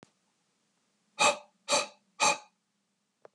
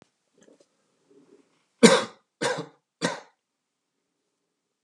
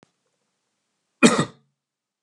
{"exhalation_length": "3.3 s", "exhalation_amplitude": 8917, "exhalation_signal_mean_std_ratio": 0.3, "three_cough_length": "4.8 s", "three_cough_amplitude": 31646, "three_cough_signal_mean_std_ratio": 0.21, "cough_length": "2.2 s", "cough_amplitude": 31209, "cough_signal_mean_std_ratio": 0.22, "survey_phase": "alpha (2021-03-01 to 2021-08-12)", "age": "45-64", "gender": "Male", "wearing_mask": "No", "symptom_none": true, "smoker_status": "Never smoked", "respiratory_condition_asthma": false, "respiratory_condition_other": false, "recruitment_source": "REACT", "submission_delay": "2 days", "covid_test_result": "Negative", "covid_test_method": "RT-qPCR"}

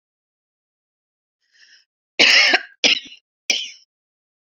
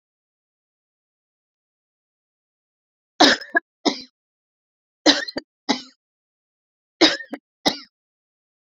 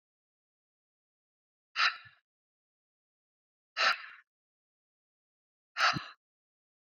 {"cough_length": "4.4 s", "cough_amplitude": 29593, "cough_signal_mean_std_ratio": 0.31, "three_cough_length": "8.6 s", "three_cough_amplitude": 31960, "three_cough_signal_mean_std_ratio": 0.22, "exhalation_length": "7.0 s", "exhalation_amplitude": 6471, "exhalation_signal_mean_std_ratio": 0.23, "survey_phase": "beta (2021-08-13 to 2022-03-07)", "age": "45-64", "gender": "Female", "wearing_mask": "No", "symptom_none": true, "smoker_status": "Never smoked", "respiratory_condition_asthma": false, "respiratory_condition_other": false, "recruitment_source": "REACT", "submission_delay": "1 day", "covid_test_result": "Negative", "covid_test_method": "RT-qPCR"}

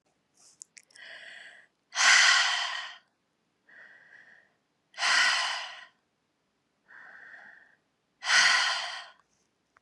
{"exhalation_length": "9.8 s", "exhalation_amplitude": 15917, "exhalation_signal_mean_std_ratio": 0.39, "survey_phase": "beta (2021-08-13 to 2022-03-07)", "age": "45-64", "gender": "Female", "wearing_mask": "No", "symptom_runny_or_blocked_nose": true, "symptom_sore_throat": true, "symptom_headache": true, "symptom_onset": "3 days", "smoker_status": "Never smoked", "respiratory_condition_asthma": false, "respiratory_condition_other": false, "recruitment_source": "Test and Trace", "submission_delay": "2 days", "covid_test_result": "Positive", "covid_test_method": "RT-qPCR", "covid_ct_value": 18.8, "covid_ct_gene": "ORF1ab gene", "covid_ct_mean": 19.7, "covid_viral_load": "330000 copies/ml", "covid_viral_load_category": "Low viral load (10K-1M copies/ml)"}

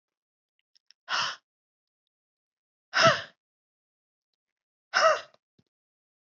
{"exhalation_length": "6.3 s", "exhalation_amplitude": 12794, "exhalation_signal_mean_std_ratio": 0.25, "survey_phase": "alpha (2021-03-01 to 2021-08-12)", "age": "45-64", "gender": "Female", "wearing_mask": "No", "symptom_none": true, "symptom_cough_any": true, "smoker_status": "Never smoked", "respiratory_condition_asthma": false, "respiratory_condition_other": false, "recruitment_source": "REACT", "submission_delay": "1 day", "covid_test_result": "Negative", "covid_test_method": "RT-qPCR"}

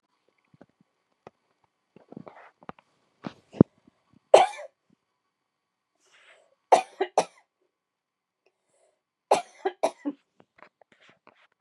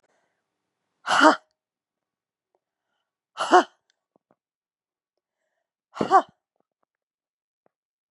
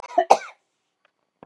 {"three_cough_length": "11.6 s", "three_cough_amplitude": 32767, "three_cough_signal_mean_std_ratio": 0.16, "exhalation_length": "8.1 s", "exhalation_amplitude": 28964, "exhalation_signal_mean_std_ratio": 0.2, "cough_length": "1.5 s", "cough_amplitude": 31205, "cough_signal_mean_std_ratio": 0.24, "survey_phase": "beta (2021-08-13 to 2022-03-07)", "age": "45-64", "gender": "Female", "wearing_mask": "No", "symptom_none": true, "smoker_status": "Never smoked", "respiratory_condition_asthma": false, "respiratory_condition_other": false, "recruitment_source": "REACT", "submission_delay": "1 day", "covid_test_result": "Negative", "covid_test_method": "RT-qPCR"}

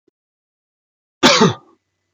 {"cough_length": "2.1 s", "cough_amplitude": 31804, "cough_signal_mean_std_ratio": 0.3, "survey_phase": "beta (2021-08-13 to 2022-03-07)", "age": "45-64", "gender": "Male", "wearing_mask": "No", "symptom_none": true, "smoker_status": "Never smoked", "respiratory_condition_asthma": false, "respiratory_condition_other": false, "recruitment_source": "REACT", "submission_delay": "5 days", "covid_test_result": "Negative", "covid_test_method": "RT-qPCR"}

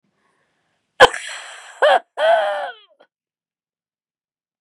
{"cough_length": "4.6 s", "cough_amplitude": 32768, "cough_signal_mean_std_ratio": 0.32, "survey_phase": "beta (2021-08-13 to 2022-03-07)", "age": "45-64", "gender": "Female", "wearing_mask": "Yes", "symptom_none": true, "smoker_status": "Never smoked", "respiratory_condition_asthma": true, "respiratory_condition_other": false, "recruitment_source": "REACT", "submission_delay": "4 days", "covid_test_result": "Negative", "covid_test_method": "RT-qPCR", "influenza_a_test_result": "Negative", "influenza_b_test_result": "Negative"}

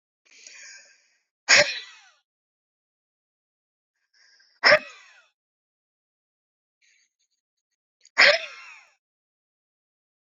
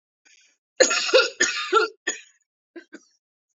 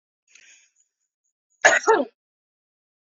{"exhalation_length": "10.2 s", "exhalation_amplitude": 26038, "exhalation_signal_mean_std_ratio": 0.2, "three_cough_length": "3.6 s", "three_cough_amplitude": 27734, "three_cough_signal_mean_std_ratio": 0.38, "cough_length": "3.1 s", "cough_amplitude": 26859, "cough_signal_mean_std_ratio": 0.25, "survey_phase": "beta (2021-08-13 to 2022-03-07)", "age": "18-44", "gender": "Female", "wearing_mask": "No", "symptom_runny_or_blocked_nose": true, "symptom_headache": true, "symptom_onset": "13 days", "smoker_status": "Never smoked", "respiratory_condition_asthma": true, "respiratory_condition_other": false, "recruitment_source": "REACT", "submission_delay": "1 day", "covid_test_result": "Negative", "covid_test_method": "RT-qPCR", "influenza_a_test_result": "Negative", "influenza_b_test_result": "Negative"}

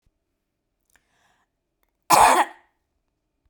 {"cough_length": "3.5 s", "cough_amplitude": 29311, "cough_signal_mean_std_ratio": 0.25, "survey_phase": "beta (2021-08-13 to 2022-03-07)", "age": "65+", "gender": "Female", "wearing_mask": "No", "symptom_none": true, "smoker_status": "Ex-smoker", "respiratory_condition_asthma": false, "respiratory_condition_other": false, "recruitment_source": "REACT", "submission_delay": "1 day", "covid_test_result": "Negative", "covid_test_method": "RT-qPCR"}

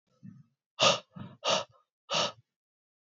{"exhalation_length": "3.1 s", "exhalation_amplitude": 10527, "exhalation_signal_mean_std_ratio": 0.35, "survey_phase": "beta (2021-08-13 to 2022-03-07)", "age": "18-44", "gender": "Male", "wearing_mask": "No", "symptom_fatigue": true, "symptom_onset": "2 days", "smoker_status": "Never smoked", "respiratory_condition_asthma": false, "respiratory_condition_other": false, "recruitment_source": "Test and Trace", "submission_delay": "1 day", "covid_test_result": "Positive", "covid_test_method": "ePCR"}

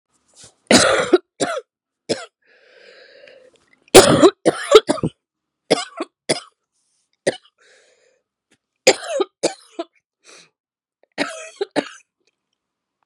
{"cough_length": "13.1 s", "cough_amplitude": 32768, "cough_signal_mean_std_ratio": 0.28, "survey_phase": "beta (2021-08-13 to 2022-03-07)", "age": "45-64", "gender": "Female", "wearing_mask": "No", "symptom_cough_any": true, "symptom_new_continuous_cough": true, "symptom_runny_or_blocked_nose": true, "symptom_sore_throat": true, "symptom_fatigue": true, "symptom_headache": true, "smoker_status": "Never smoked", "respiratory_condition_asthma": false, "respiratory_condition_other": false, "recruitment_source": "Test and Trace", "submission_delay": "2 days", "covid_test_result": "Positive", "covid_test_method": "LFT"}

